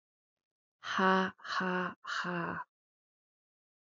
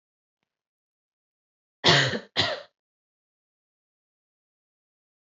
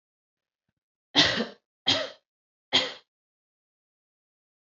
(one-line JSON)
{"exhalation_length": "3.8 s", "exhalation_amplitude": 6457, "exhalation_signal_mean_std_ratio": 0.46, "cough_length": "5.2 s", "cough_amplitude": 19837, "cough_signal_mean_std_ratio": 0.23, "three_cough_length": "4.8 s", "three_cough_amplitude": 16303, "three_cough_signal_mean_std_ratio": 0.27, "survey_phase": "alpha (2021-03-01 to 2021-08-12)", "age": "18-44", "gender": "Female", "wearing_mask": "No", "symptom_abdominal_pain": true, "symptom_fatigue": true, "symptom_fever_high_temperature": true, "symptom_headache": true, "symptom_onset": "3 days", "smoker_status": "Never smoked", "respiratory_condition_asthma": false, "respiratory_condition_other": false, "recruitment_source": "Test and Trace", "submission_delay": "1 day", "covid_test_result": "Positive", "covid_test_method": "RT-qPCR", "covid_ct_value": 13.8, "covid_ct_gene": "ORF1ab gene", "covid_ct_mean": 14.1, "covid_viral_load": "23000000 copies/ml", "covid_viral_load_category": "High viral load (>1M copies/ml)"}